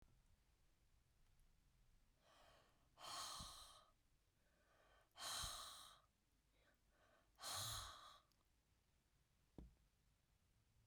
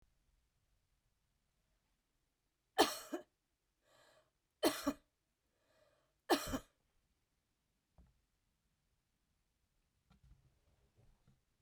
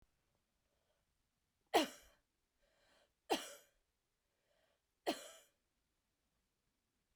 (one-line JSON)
{"exhalation_length": "10.9 s", "exhalation_amplitude": 443, "exhalation_signal_mean_std_ratio": 0.44, "cough_length": "11.6 s", "cough_amplitude": 5363, "cough_signal_mean_std_ratio": 0.18, "three_cough_length": "7.2 s", "three_cough_amplitude": 3930, "three_cough_signal_mean_std_ratio": 0.18, "survey_phase": "beta (2021-08-13 to 2022-03-07)", "age": "65+", "gender": "Female", "wearing_mask": "No", "symptom_none": true, "smoker_status": "Ex-smoker", "respiratory_condition_asthma": false, "respiratory_condition_other": false, "recruitment_source": "REACT", "submission_delay": "1 day", "covid_test_result": "Negative", "covid_test_method": "RT-qPCR"}